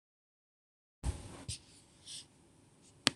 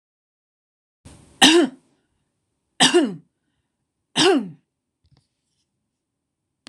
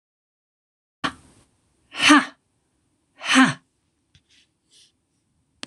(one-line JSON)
{"cough_length": "3.2 s", "cough_amplitude": 22974, "cough_signal_mean_std_ratio": 0.24, "three_cough_length": "6.7 s", "three_cough_amplitude": 26028, "three_cough_signal_mean_std_ratio": 0.29, "exhalation_length": "5.7 s", "exhalation_amplitude": 26027, "exhalation_signal_mean_std_ratio": 0.24, "survey_phase": "beta (2021-08-13 to 2022-03-07)", "age": "65+", "gender": "Female", "wearing_mask": "No", "symptom_none": true, "smoker_status": "Never smoked", "respiratory_condition_asthma": false, "respiratory_condition_other": false, "recruitment_source": "REACT", "submission_delay": "2 days", "covid_test_result": "Negative", "covid_test_method": "RT-qPCR", "influenza_a_test_result": "Unknown/Void", "influenza_b_test_result": "Unknown/Void"}